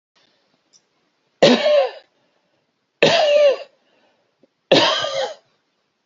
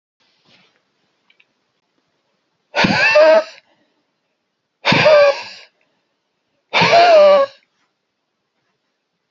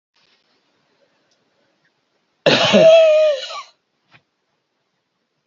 three_cough_length: 6.1 s
three_cough_amplitude: 29999
three_cough_signal_mean_std_ratio: 0.42
exhalation_length: 9.3 s
exhalation_amplitude: 32207
exhalation_signal_mean_std_ratio: 0.4
cough_length: 5.5 s
cough_amplitude: 28549
cough_signal_mean_std_ratio: 0.36
survey_phase: beta (2021-08-13 to 2022-03-07)
age: 45-64
gender: Male
wearing_mask: 'No'
symptom_none: true
smoker_status: Never smoked
respiratory_condition_asthma: false
respiratory_condition_other: false
recruitment_source: REACT
submission_delay: 3 days
covid_test_result: Negative
covid_test_method: RT-qPCR
influenza_a_test_result: Negative
influenza_b_test_result: Negative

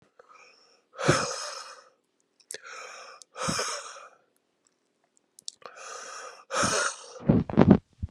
exhalation_length: 8.1 s
exhalation_amplitude: 27722
exhalation_signal_mean_std_ratio: 0.35
survey_phase: alpha (2021-03-01 to 2021-08-12)
age: 18-44
gender: Male
wearing_mask: 'No'
symptom_cough_any: true
symptom_new_continuous_cough: true
symptom_shortness_of_breath: true
symptom_fatigue: true
symptom_fever_high_temperature: true
symptom_headache: true
symptom_change_to_sense_of_smell_or_taste: true
symptom_onset: 4 days
smoker_status: Current smoker (1 to 10 cigarettes per day)
respiratory_condition_asthma: false
respiratory_condition_other: false
recruitment_source: Test and Trace
submission_delay: 2 days
covid_test_result: Positive
covid_test_method: RT-qPCR
covid_ct_value: 18.7
covid_ct_gene: ORF1ab gene
covid_ct_mean: 19.2
covid_viral_load: 500000 copies/ml
covid_viral_load_category: Low viral load (10K-1M copies/ml)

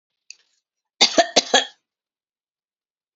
cough_length: 3.2 s
cough_amplitude: 30123
cough_signal_mean_std_ratio: 0.25
survey_phase: alpha (2021-03-01 to 2021-08-12)
age: 65+
gender: Female
wearing_mask: 'No'
symptom_none: true
smoker_status: Never smoked
respiratory_condition_asthma: false
respiratory_condition_other: false
recruitment_source: REACT
submission_delay: 1 day
covid_test_result: Negative
covid_test_method: RT-qPCR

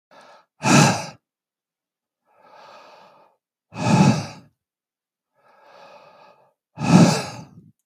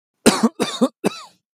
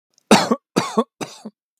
exhalation_length: 7.9 s
exhalation_amplitude: 32056
exhalation_signal_mean_std_ratio: 0.32
cough_length: 1.5 s
cough_amplitude: 32768
cough_signal_mean_std_ratio: 0.41
three_cough_length: 1.8 s
three_cough_amplitude: 32768
three_cough_signal_mean_std_ratio: 0.36
survey_phase: beta (2021-08-13 to 2022-03-07)
age: 45-64
gender: Male
wearing_mask: 'No'
symptom_none: true
smoker_status: Ex-smoker
respiratory_condition_asthma: false
respiratory_condition_other: false
recruitment_source: REACT
submission_delay: 0 days
covid_test_result: Negative
covid_test_method: RT-qPCR
influenza_a_test_result: Negative
influenza_b_test_result: Negative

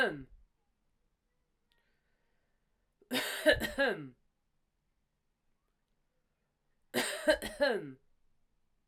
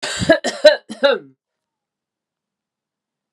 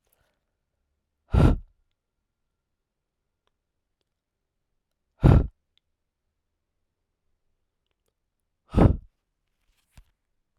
three_cough_length: 8.9 s
three_cough_amplitude: 7863
three_cough_signal_mean_std_ratio: 0.32
cough_length: 3.3 s
cough_amplitude: 32768
cough_signal_mean_std_ratio: 0.31
exhalation_length: 10.6 s
exhalation_amplitude: 22764
exhalation_signal_mean_std_ratio: 0.19
survey_phase: alpha (2021-03-01 to 2021-08-12)
age: 18-44
gender: Female
wearing_mask: 'No'
symptom_none: true
symptom_fatigue: true
smoker_status: Current smoker (11 or more cigarettes per day)
respiratory_condition_asthma: false
respiratory_condition_other: false
recruitment_source: REACT
submission_delay: 1 day
covid_test_result: Negative
covid_test_method: RT-qPCR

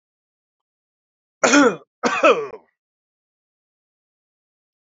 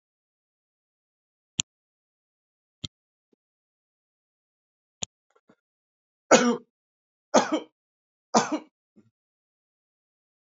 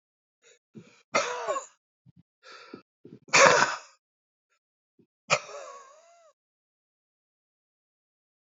cough_length: 4.9 s
cough_amplitude: 28199
cough_signal_mean_std_ratio: 0.28
three_cough_length: 10.4 s
three_cough_amplitude: 25493
three_cough_signal_mean_std_ratio: 0.18
exhalation_length: 8.5 s
exhalation_amplitude: 25923
exhalation_signal_mean_std_ratio: 0.24
survey_phase: alpha (2021-03-01 to 2021-08-12)
age: 65+
gender: Male
wearing_mask: 'No'
symptom_none: true
smoker_status: Ex-smoker
respiratory_condition_asthma: false
respiratory_condition_other: false
recruitment_source: REACT
submission_delay: 2 days
covid_test_result: Negative
covid_test_method: RT-qPCR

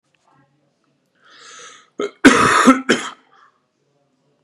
cough_length: 4.4 s
cough_amplitude: 32768
cough_signal_mean_std_ratio: 0.32
survey_phase: beta (2021-08-13 to 2022-03-07)
age: 18-44
gender: Female
wearing_mask: 'No'
symptom_cough_any: true
symptom_runny_or_blocked_nose: true
symptom_fatigue: true
symptom_headache: true
symptom_onset: 3 days
smoker_status: Never smoked
respiratory_condition_asthma: false
respiratory_condition_other: false
recruitment_source: Test and Trace
submission_delay: 2 days
covid_test_result: Positive
covid_test_method: RT-qPCR
covid_ct_value: 28.0
covid_ct_gene: ORF1ab gene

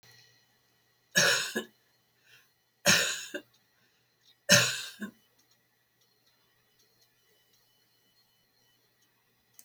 three_cough_length: 9.6 s
three_cough_amplitude: 17617
three_cough_signal_mean_std_ratio: 0.26
survey_phase: beta (2021-08-13 to 2022-03-07)
age: 65+
gender: Female
wearing_mask: 'No'
symptom_shortness_of_breath: true
symptom_fatigue: true
smoker_status: Ex-smoker
respiratory_condition_asthma: true
respiratory_condition_other: false
recruitment_source: REACT
submission_delay: 2 days
covid_test_result: Negative
covid_test_method: RT-qPCR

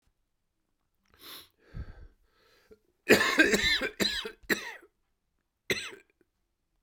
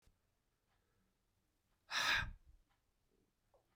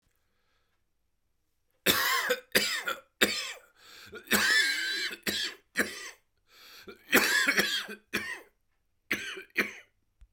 cough_length: 6.8 s
cough_amplitude: 15423
cough_signal_mean_std_ratio: 0.33
exhalation_length: 3.8 s
exhalation_amplitude: 2260
exhalation_signal_mean_std_ratio: 0.28
three_cough_length: 10.3 s
three_cough_amplitude: 15077
three_cough_signal_mean_std_ratio: 0.48
survey_phase: beta (2021-08-13 to 2022-03-07)
age: 45-64
gender: Male
wearing_mask: 'No'
symptom_cough_any: true
symptom_shortness_of_breath: true
symptom_sore_throat: true
symptom_fatigue: true
symptom_fever_high_temperature: true
symptom_headache: true
symptom_change_to_sense_of_smell_or_taste: true
symptom_loss_of_taste: true
symptom_onset: 9 days
smoker_status: Ex-smoker
respiratory_condition_asthma: false
respiratory_condition_other: false
recruitment_source: Test and Trace
submission_delay: 1 day
covid_test_result: Positive
covid_test_method: LAMP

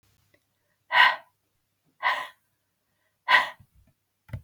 exhalation_length: 4.4 s
exhalation_amplitude: 18583
exhalation_signal_mean_std_ratio: 0.28
survey_phase: beta (2021-08-13 to 2022-03-07)
age: 45-64
gender: Female
wearing_mask: 'No'
symptom_cough_any: true
symptom_new_continuous_cough: true
symptom_runny_or_blocked_nose: true
symptom_fatigue: true
symptom_onset: 2 days
smoker_status: Never smoked
respiratory_condition_asthma: false
respiratory_condition_other: false
recruitment_source: Test and Trace
submission_delay: 0 days
covid_test_result: Positive
covid_test_method: ePCR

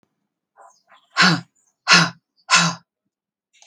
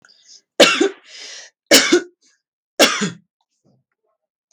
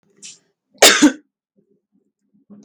exhalation_length: 3.7 s
exhalation_amplitude: 32768
exhalation_signal_mean_std_ratio: 0.33
three_cough_length: 4.5 s
three_cough_amplitude: 32768
three_cough_signal_mean_std_ratio: 0.34
cough_length: 2.6 s
cough_amplitude: 32768
cough_signal_mean_std_ratio: 0.27
survey_phase: beta (2021-08-13 to 2022-03-07)
age: 45-64
gender: Female
wearing_mask: 'No'
symptom_headache: true
symptom_onset: 2 days
smoker_status: Current smoker (1 to 10 cigarettes per day)
respiratory_condition_asthma: false
respiratory_condition_other: false
recruitment_source: Test and Trace
submission_delay: 1 day
covid_test_result: Negative
covid_test_method: RT-qPCR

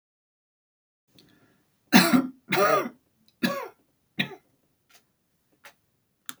three_cough_length: 6.4 s
three_cough_amplitude: 29257
three_cough_signal_mean_std_ratio: 0.29
survey_phase: alpha (2021-03-01 to 2021-08-12)
age: 65+
gender: Female
wearing_mask: 'No'
symptom_none: true
smoker_status: Never smoked
respiratory_condition_asthma: false
respiratory_condition_other: false
recruitment_source: REACT
submission_delay: 1 day
covid_test_result: Negative
covid_test_method: RT-qPCR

